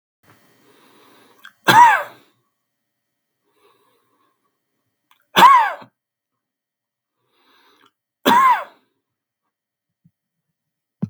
{"three_cough_length": "11.1 s", "three_cough_amplitude": 32768, "three_cough_signal_mean_std_ratio": 0.25, "survey_phase": "beta (2021-08-13 to 2022-03-07)", "age": "45-64", "gender": "Male", "wearing_mask": "No", "symptom_cough_any": true, "smoker_status": "Never smoked", "respiratory_condition_asthma": true, "respiratory_condition_other": false, "recruitment_source": "REACT", "submission_delay": "1 day", "covid_test_result": "Negative", "covid_test_method": "RT-qPCR", "influenza_a_test_result": "Negative", "influenza_b_test_result": "Negative"}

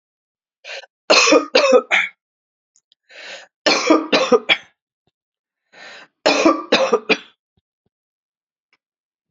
{"three_cough_length": "9.3 s", "three_cough_amplitude": 31412, "three_cough_signal_mean_std_ratio": 0.38, "survey_phase": "beta (2021-08-13 to 2022-03-07)", "age": "45-64", "gender": "Female", "wearing_mask": "No", "symptom_cough_any": true, "symptom_runny_or_blocked_nose": true, "symptom_shortness_of_breath": true, "symptom_fatigue": true, "symptom_headache": true, "symptom_onset": "4 days", "smoker_status": "Current smoker (1 to 10 cigarettes per day)", "respiratory_condition_asthma": false, "respiratory_condition_other": false, "recruitment_source": "Test and Trace", "submission_delay": "1 day", "covid_test_result": "Positive", "covid_test_method": "RT-qPCR", "covid_ct_value": 24.9, "covid_ct_gene": "N gene"}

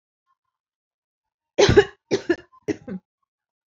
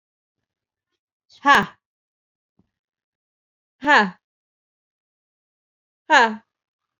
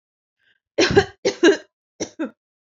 {"cough_length": "3.7 s", "cough_amplitude": 27108, "cough_signal_mean_std_ratio": 0.26, "exhalation_length": "7.0 s", "exhalation_amplitude": 27818, "exhalation_signal_mean_std_ratio": 0.23, "three_cough_length": "2.7 s", "three_cough_amplitude": 26356, "three_cough_signal_mean_std_ratio": 0.35, "survey_phase": "alpha (2021-03-01 to 2021-08-12)", "age": "18-44", "gender": "Female", "wearing_mask": "No", "symptom_none": true, "smoker_status": "Ex-smoker", "respiratory_condition_asthma": false, "respiratory_condition_other": false, "recruitment_source": "REACT", "submission_delay": "2 days", "covid_test_result": "Negative", "covid_test_method": "RT-qPCR"}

